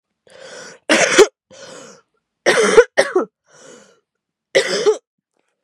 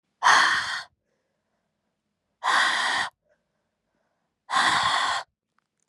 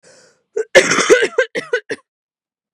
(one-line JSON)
{"three_cough_length": "5.6 s", "three_cough_amplitude": 32768, "three_cough_signal_mean_std_ratio": 0.38, "exhalation_length": "5.9 s", "exhalation_amplitude": 20431, "exhalation_signal_mean_std_ratio": 0.46, "cough_length": "2.7 s", "cough_amplitude": 32768, "cough_signal_mean_std_ratio": 0.41, "survey_phase": "beta (2021-08-13 to 2022-03-07)", "age": "18-44", "gender": "Female", "wearing_mask": "No", "symptom_cough_any": true, "symptom_new_continuous_cough": true, "symptom_runny_or_blocked_nose": true, "symptom_shortness_of_breath": true, "symptom_sore_throat": true, "symptom_fatigue": true, "symptom_headache": true, "symptom_change_to_sense_of_smell_or_taste": true, "symptom_other": true, "symptom_onset": "3 days", "smoker_status": "Current smoker (1 to 10 cigarettes per day)", "respiratory_condition_asthma": false, "respiratory_condition_other": false, "recruitment_source": "Test and Trace", "submission_delay": "2 days", "covid_test_result": "Positive", "covid_test_method": "RT-qPCR", "covid_ct_value": 20.5, "covid_ct_gene": "ORF1ab gene", "covid_ct_mean": 20.8, "covid_viral_load": "150000 copies/ml", "covid_viral_load_category": "Low viral load (10K-1M copies/ml)"}